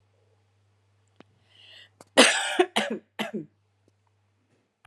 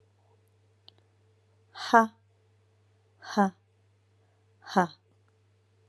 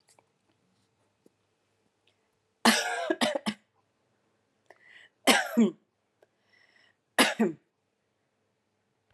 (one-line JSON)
{"cough_length": "4.9 s", "cough_amplitude": 27740, "cough_signal_mean_std_ratio": 0.27, "exhalation_length": "5.9 s", "exhalation_amplitude": 18733, "exhalation_signal_mean_std_ratio": 0.2, "three_cough_length": "9.1 s", "three_cough_amplitude": 17707, "three_cough_signal_mean_std_ratio": 0.28, "survey_phase": "beta (2021-08-13 to 2022-03-07)", "age": "18-44", "gender": "Male", "wearing_mask": "No", "symptom_cough_any": true, "symptom_sore_throat": true, "smoker_status": "Never smoked", "respiratory_condition_asthma": true, "respiratory_condition_other": false, "recruitment_source": "Test and Trace", "submission_delay": "2 days", "covid_test_result": "Positive", "covid_test_method": "ePCR"}